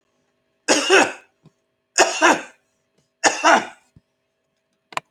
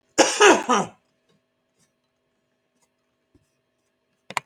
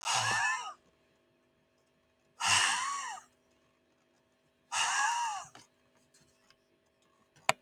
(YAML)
three_cough_length: 5.1 s
three_cough_amplitude: 28831
three_cough_signal_mean_std_ratio: 0.36
cough_length: 4.5 s
cough_amplitude: 27602
cough_signal_mean_std_ratio: 0.26
exhalation_length: 7.6 s
exhalation_amplitude: 16385
exhalation_signal_mean_std_ratio: 0.44
survey_phase: alpha (2021-03-01 to 2021-08-12)
age: 45-64
gender: Male
wearing_mask: 'No'
symptom_none: true
smoker_status: Never smoked
respiratory_condition_asthma: false
respiratory_condition_other: false
recruitment_source: REACT
submission_delay: 3 days
covid_test_result: Negative
covid_test_method: RT-qPCR